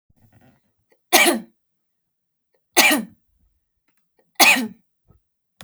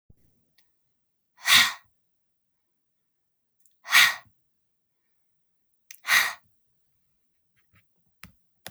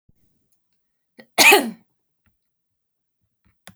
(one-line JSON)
{"three_cough_length": "5.6 s", "three_cough_amplitude": 32768, "three_cough_signal_mean_std_ratio": 0.29, "exhalation_length": "8.7 s", "exhalation_amplitude": 21249, "exhalation_signal_mean_std_ratio": 0.22, "cough_length": "3.8 s", "cough_amplitude": 32768, "cough_signal_mean_std_ratio": 0.22, "survey_phase": "beta (2021-08-13 to 2022-03-07)", "age": "18-44", "gender": "Female", "wearing_mask": "No", "symptom_cough_any": true, "symptom_runny_or_blocked_nose": true, "symptom_fatigue": true, "symptom_headache": true, "smoker_status": "Never smoked", "respiratory_condition_asthma": false, "respiratory_condition_other": false, "recruitment_source": "Test and Trace", "submission_delay": "1 day", "covid_test_result": "Negative", "covid_test_method": "RT-qPCR"}